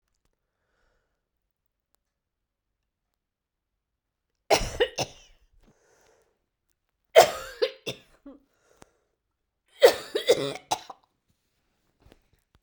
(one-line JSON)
{"three_cough_length": "12.6 s", "three_cough_amplitude": 30723, "three_cough_signal_mean_std_ratio": 0.2, "survey_phase": "beta (2021-08-13 to 2022-03-07)", "age": "45-64", "gender": "Female", "wearing_mask": "No", "symptom_cough_any": true, "symptom_runny_or_blocked_nose": true, "symptom_shortness_of_breath": true, "symptom_sore_throat": true, "symptom_diarrhoea": true, "symptom_fatigue": true, "symptom_headache": true, "smoker_status": "Ex-smoker", "respiratory_condition_asthma": false, "respiratory_condition_other": false, "recruitment_source": "Test and Trace", "submission_delay": "0 days", "covid_test_result": "Positive", "covid_test_method": "LFT"}